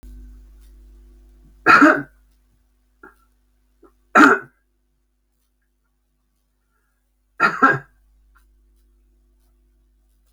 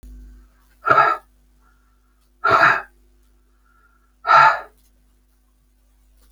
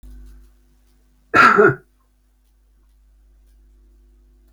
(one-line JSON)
{"three_cough_length": "10.3 s", "three_cough_amplitude": 31699, "three_cough_signal_mean_std_ratio": 0.24, "exhalation_length": "6.3 s", "exhalation_amplitude": 28458, "exhalation_signal_mean_std_ratio": 0.32, "cough_length": "4.5 s", "cough_amplitude": 29406, "cough_signal_mean_std_ratio": 0.26, "survey_phase": "beta (2021-08-13 to 2022-03-07)", "age": "65+", "gender": "Male", "wearing_mask": "No", "symptom_none": true, "smoker_status": "Current smoker (e-cigarettes or vapes only)", "respiratory_condition_asthma": false, "respiratory_condition_other": false, "recruitment_source": "REACT", "submission_delay": "1 day", "covid_test_result": "Negative", "covid_test_method": "RT-qPCR"}